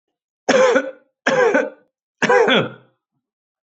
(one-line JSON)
{"three_cough_length": "3.7 s", "three_cough_amplitude": 24800, "three_cough_signal_mean_std_ratio": 0.5, "survey_phase": "beta (2021-08-13 to 2022-03-07)", "age": "45-64", "gender": "Male", "wearing_mask": "No", "symptom_runny_or_blocked_nose": true, "symptom_sore_throat": true, "symptom_change_to_sense_of_smell_or_taste": true, "symptom_loss_of_taste": true, "symptom_onset": "3 days", "smoker_status": "Never smoked", "respiratory_condition_asthma": false, "respiratory_condition_other": false, "recruitment_source": "Test and Trace", "submission_delay": "1 day", "covid_test_result": "Positive", "covid_test_method": "RT-qPCR", "covid_ct_value": 17.5, "covid_ct_gene": "ORF1ab gene", "covid_ct_mean": 17.7, "covid_viral_load": "1600000 copies/ml", "covid_viral_load_category": "High viral load (>1M copies/ml)"}